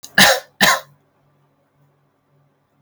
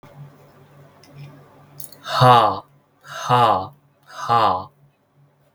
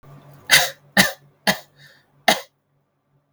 {
  "cough_length": "2.8 s",
  "cough_amplitude": 32768,
  "cough_signal_mean_std_ratio": 0.3,
  "exhalation_length": "5.5 s",
  "exhalation_amplitude": 32768,
  "exhalation_signal_mean_std_ratio": 0.39,
  "three_cough_length": "3.3 s",
  "three_cough_amplitude": 32768,
  "three_cough_signal_mean_std_ratio": 0.3,
  "survey_phase": "beta (2021-08-13 to 2022-03-07)",
  "age": "18-44",
  "gender": "Male",
  "wearing_mask": "No",
  "symptom_none": true,
  "smoker_status": "Never smoked",
  "respiratory_condition_asthma": false,
  "respiratory_condition_other": false,
  "recruitment_source": "REACT",
  "submission_delay": "2 days",
  "covid_test_result": "Negative",
  "covid_test_method": "RT-qPCR"
}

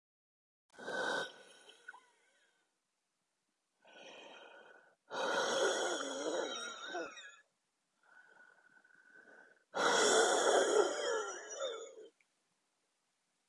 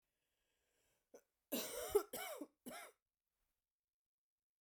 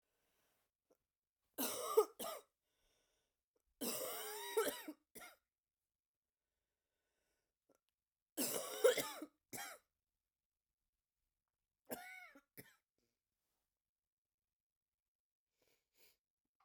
{
  "exhalation_length": "13.5 s",
  "exhalation_amplitude": 4330,
  "exhalation_signal_mean_std_ratio": 0.46,
  "cough_length": "4.6 s",
  "cough_amplitude": 2687,
  "cough_signal_mean_std_ratio": 0.29,
  "three_cough_length": "16.6 s",
  "three_cough_amplitude": 3478,
  "three_cough_signal_mean_std_ratio": 0.26,
  "survey_phase": "beta (2021-08-13 to 2022-03-07)",
  "age": "18-44",
  "gender": "Female",
  "wearing_mask": "No",
  "symptom_cough_any": true,
  "symptom_new_continuous_cough": true,
  "symptom_runny_or_blocked_nose": true,
  "symptom_shortness_of_breath": true,
  "symptom_sore_throat": true,
  "symptom_fatigue": true,
  "symptom_headache": true,
  "symptom_change_to_sense_of_smell_or_taste": true,
  "symptom_loss_of_taste": true,
  "symptom_other": true,
  "symptom_onset": "7 days",
  "smoker_status": "Current smoker (e-cigarettes or vapes only)",
  "respiratory_condition_asthma": false,
  "respiratory_condition_other": false,
  "recruitment_source": "Test and Trace",
  "submission_delay": "1 day",
  "covid_test_result": "Positive",
  "covid_test_method": "RT-qPCR",
  "covid_ct_value": 22.1,
  "covid_ct_gene": "ORF1ab gene"
}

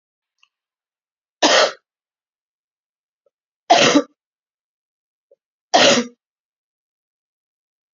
{
  "three_cough_length": "7.9 s",
  "three_cough_amplitude": 29033,
  "three_cough_signal_mean_std_ratio": 0.27,
  "survey_phase": "beta (2021-08-13 to 2022-03-07)",
  "age": "45-64",
  "gender": "Female",
  "wearing_mask": "No",
  "symptom_cough_any": true,
  "symptom_shortness_of_breath": true,
  "symptom_headache": true,
  "symptom_change_to_sense_of_smell_or_taste": true,
  "symptom_loss_of_taste": true,
  "smoker_status": "Ex-smoker",
  "respiratory_condition_asthma": false,
  "respiratory_condition_other": false,
  "recruitment_source": "Test and Trace",
  "submission_delay": "2 days",
  "covid_test_result": "Positive",
  "covid_test_method": "RT-qPCR",
  "covid_ct_value": 11.5,
  "covid_ct_gene": "N gene",
  "covid_ct_mean": 11.6,
  "covid_viral_load": "150000000 copies/ml",
  "covid_viral_load_category": "High viral load (>1M copies/ml)"
}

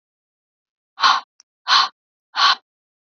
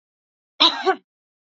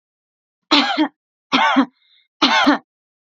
{
  "exhalation_length": "3.2 s",
  "exhalation_amplitude": 28694,
  "exhalation_signal_mean_std_ratio": 0.33,
  "cough_length": "1.5 s",
  "cough_amplitude": 29540,
  "cough_signal_mean_std_ratio": 0.3,
  "three_cough_length": "3.3 s",
  "three_cough_amplitude": 32114,
  "three_cough_signal_mean_std_ratio": 0.46,
  "survey_phase": "beta (2021-08-13 to 2022-03-07)",
  "age": "18-44",
  "gender": "Female",
  "wearing_mask": "No",
  "symptom_cough_any": true,
  "symptom_onset": "12 days",
  "smoker_status": "Never smoked",
  "respiratory_condition_asthma": false,
  "respiratory_condition_other": false,
  "recruitment_source": "REACT",
  "submission_delay": "1 day",
  "covid_test_result": "Negative",
  "covid_test_method": "RT-qPCR",
  "influenza_a_test_result": "Negative",
  "influenza_b_test_result": "Negative"
}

